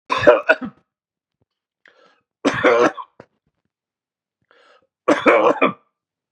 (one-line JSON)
{"three_cough_length": "6.3 s", "three_cough_amplitude": 32767, "three_cough_signal_mean_std_ratio": 0.36, "survey_phase": "beta (2021-08-13 to 2022-03-07)", "age": "45-64", "gender": "Male", "wearing_mask": "No", "symptom_cough_any": true, "symptom_runny_or_blocked_nose": true, "symptom_fatigue": true, "symptom_fever_high_temperature": true, "symptom_headache": true, "symptom_loss_of_taste": true, "symptom_onset": "7 days", "smoker_status": "Never smoked", "respiratory_condition_asthma": false, "respiratory_condition_other": false, "recruitment_source": "Test and Trace", "submission_delay": "5 days", "covid_test_result": "Positive", "covid_test_method": "RT-qPCR", "covid_ct_value": 17.3, "covid_ct_gene": "N gene", "covid_ct_mean": 18.1, "covid_viral_load": "1200000 copies/ml", "covid_viral_load_category": "High viral load (>1M copies/ml)"}